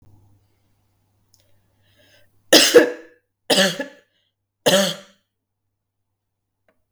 {"three_cough_length": "6.9 s", "three_cough_amplitude": 32768, "three_cough_signal_mean_std_ratio": 0.27, "survey_phase": "beta (2021-08-13 to 2022-03-07)", "age": "45-64", "gender": "Female", "wearing_mask": "No", "symptom_cough_any": true, "symptom_runny_or_blocked_nose": true, "symptom_sore_throat": true, "symptom_fatigue": true, "symptom_fever_high_temperature": true, "symptom_headache": true, "symptom_change_to_sense_of_smell_or_taste": true, "symptom_loss_of_taste": true, "smoker_status": "Never smoked", "respiratory_condition_asthma": false, "respiratory_condition_other": false, "recruitment_source": "Test and Trace", "submission_delay": "2 days", "covid_test_result": "Positive", "covid_test_method": "RT-qPCR", "covid_ct_value": 18.3, "covid_ct_gene": "ORF1ab gene", "covid_ct_mean": 18.6, "covid_viral_load": "780000 copies/ml", "covid_viral_load_category": "Low viral load (10K-1M copies/ml)"}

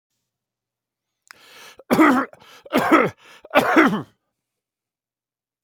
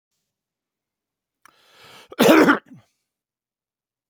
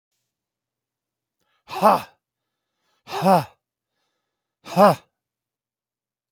{"three_cough_length": "5.6 s", "three_cough_amplitude": 28142, "three_cough_signal_mean_std_ratio": 0.37, "cough_length": "4.1 s", "cough_amplitude": 30434, "cough_signal_mean_std_ratio": 0.25, "exhalation_length": "6.3 s", "exhalation_amplitude": 27842, "exhalation_signal_mean_std_ratio": 0.25, "survey_phase": "alpha (2021-03-01 to 2021-08-12)", "age": "45-64", "gender": "Male", "wearing_mask": "No", "symptom_cough_any": true, "symptom_shortness_of_breath": true, "symptom_fatigue": true, "symptom_headache": true, "symptom_change_to_sense_of_smell_or_taste": true, "smoker_status": "Ex-smoker", "respiratory_condition_asthma": false, "respiratory_condition_other": false, "recruitment_source": "Test and Trace", "submission_delay": "2 days", "covid_test_result": "Positive", "covid_test_method": "LFT"}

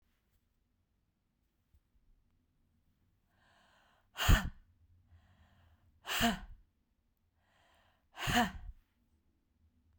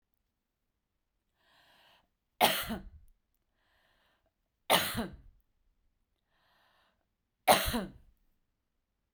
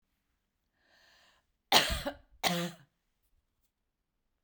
{"exhalation_length": "10.0 s", "exhalation_amplitude": 6703, "exhalation_signal_mean_std_ratio": 0.23, "three_cough_length": "9.1 s", "three_cough_amplitude": 12638, "three_cough_signal_mean_std_ratio": 0.24, "cough_length": "4.4 s", "cough_amplitude": 13944, "cough_signal_mean_std_ratio": 0.27, "survey_phase": "beta (2021-08-13 to 2022-03-07)", "age": "45-64", "gender": "Female", "wearing_mask": "No", "symptom_none": true, "smoker_status": "Never smoked", "respiratory_condition_asthma": false, "respiratory_condition_other": false, "recruitment_source": "Test and Trace", "submission_delay": "1 day", "covid_test_result": "Negative", "covid_test_method": "RT-qPCR"}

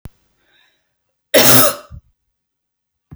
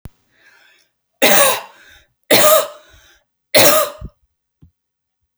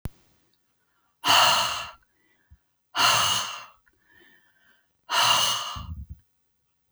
{"cough_length": "3.2 s", "cough_amplitude": 32768, "cough_signal_mean_std_ratio": 0.3, "three_cough_length": "5.4 s", "three_cough_amplitude": 32768, "three_cough_signal_mean_std_ratio": 0.37, "exhalation_length": "6.9 s", "exhalation_amplitude": 17972, "exhalation_signal_mean_std_ratio": 0.43, "survey_phase": "beta (2021-08-13 to 2022-03-07)", "age": "45-64", "gender": "Female", "wearing_mask": "No", "symptom_runny_or_blocked_nose": true, "symptom_headache": true, "symptom_onset": "4 days", "smoker_status": "Never smoked", "respiratory_condition_asthma": false, "respiratory_condition_other": false, "recruitment_source": "REACT", "submission_delay": "3 days", "covid_test_result": "Negative", "covid_test_method": "RT-qPCR", "influenza_a_test_result": "Negative", "influenza_b_test_result": "Negative"}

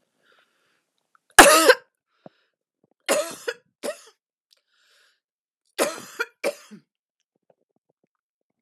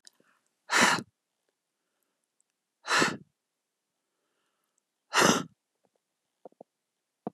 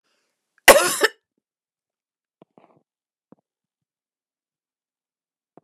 {"three_cough_length": "8.6 s", "three_cough_amplitude": 32768, "three_cough_signal_mean_std_ratio": 0.21, "exhalation_length": "7.3 s", "exhalation_amplitude": 15701, "exhalation_signal_mean_std_ratio": 0.26, "cough_length": "5.6 s", "cough_amplitude": 32768, "cough_signal_mean_std_ratio": 0.16, "survey_phase": "alpha (2021-03-01 to 2021-08-12)", "age": "45-64", "gender": "Female", "wearing_mask": "No", "symptom_none": true, "smoker_status": "Ex-smoker", "respiratory_condition_asthma": false, "respiratory_condition_other": false, "recruitment_source": "REACT", "submission_delay": "1 day", "covid_test_result": "Negative", "covid_test_method": "RT-qPCR"}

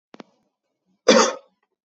{"cough_length": "1.9 s", "cough_amplitude": 28391, "cough_signal_mean_std_ratio": 0.28, "survey_phase": "beta (2021-08-13 to 2022-03-07)", "age": "18-44", "gender": "Male", "wearing_mask": "No", "symptom_cough_any": true, "symptom_runny_or_blocked_nose": true, "symptom_sore_throat": true, "symptom_fatigue": true, "symptom_fever_high_temperature": true, "symptom_headache": true, "symptom_onset": "3 days", "smoker_status": "Never smoked", "respiratory_condition_asthma": false, "respiratory_condition_other": false, "recruitment_source": "Test and Trace", "submission_delay": "2 days", "covid_test_result": "Positive", "covid_test_method": "RT-qPCR"}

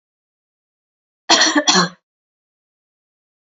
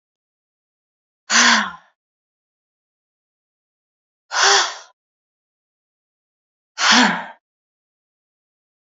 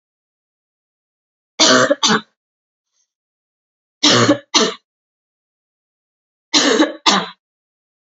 {"cough_length": "3.6 s", "cough_amplitude": 32609, "cough_signal_mean_std_ratio": 0.3, "exhalation_length": "8.9 s", "exhalation_amplitude": 31637, "exhalation_signal_mean_std_ratio": 0.28, "three_cough_length": "8.1 s", "three_cough_amplitude": 32768, "three_cough_signal_mean_std_ratio": 0.36, "survey_phase": "beta (2021-08-13 to 2022-03-07)", "age": "18-44", "gender": "Female", "wearing_mask": "No", "symptom_cough_any": true, "symptom_runny_or_blocked_nose": true, "smoker_status": "Never smoked", "respiratory_condition_asthma": false, "respiratory_condition_other": false, "recruitment_source": "Test and Trace", "submission_delay": "2 days", "covid_test_result": "Positive", "covid_test_method": "LFT"}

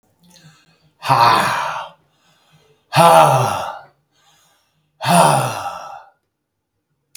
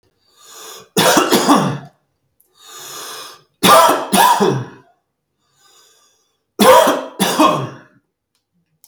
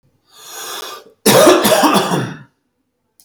{"exhalation_length": "7.2 s", "exhalation_amplitude": 32768, "exhalation_signal_mean_std_ratio": 0.42, "three_cough_length": "8.9 s", "three_cough_amplitude": 32768, "three_cough_signal_mean_std_ratio": 0.46, "cough_length": "3.2 s", "cough_amplitude": 32768, "cough_signal_mean_std_ratio": 0.5, "survey_phase": "beta (2021-08-13 to 2022-03-07)", "age": "45-64", "gender": "Male", "wearing_mask": "No", "symptom_none": true, "smoker_status": "Never smoked", "respiratory_condition_asthma": false, "respiratory_condition_other": false, "recruitment_source": "REACT", "submission_delay": "2 days", "covid_test_result": "Negative", "covid_test_method": "RT-qPCR", "influenza_a_test_result": "Negative", "influenza_b_test_result": "Negative"}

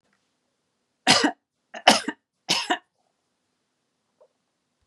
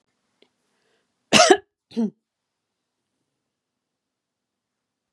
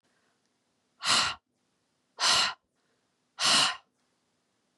{"three_cough_length": "4.9 s", "three_cough_amplitude": 32767, "three_cough_signal_mean_std_ratio": 0.26, "cough_length": "5.1 s", "cough_amplitude": 30770, "cough_signal_mean_std_ratio": 0.19, "exhalation_length": "4.8 s", "exhalation_amplitude": 9917, "exhalation_signal_mean_std_ratio": 0.36, "survey_phase": "beta (2021-08-13 to 2022-03-07)", "age": "45-64", "gender": "Female", "wearing_mask": "No", "symptom_none": true, "smoker_status": "Never smoked", "respiratory_condition_asthma": false, "respiratory_condition_other": false, "recruitment_source": "Test and Trace", "submission_delay": "1 day", "covid_test_result": "Negative", "covid_test_method": "RT-qPCR"}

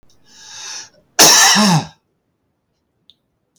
{"cough_length": "3.6 s", "cough_amplitude": 32768, "cough_signal_mean_std_ratio": 0.39, "survey_phase": "beta (2021-08-13 to 2022-03-07)", "age": "65+", "gender": "Male", "wearing_mask": "No", "symptom_none": true, "smoker_status": "Ex-smoker", "respiratory_condition_asthma": false, "respiratory_condition_other": false, "recruitment_source": "REACT", "submission_delay": "1 day", "covid_test_result": "Negative", "covid_test_method": "RT-qPCR", "influenza_a_test_result": "Negative", "influenza_b_test_result": "Negative"}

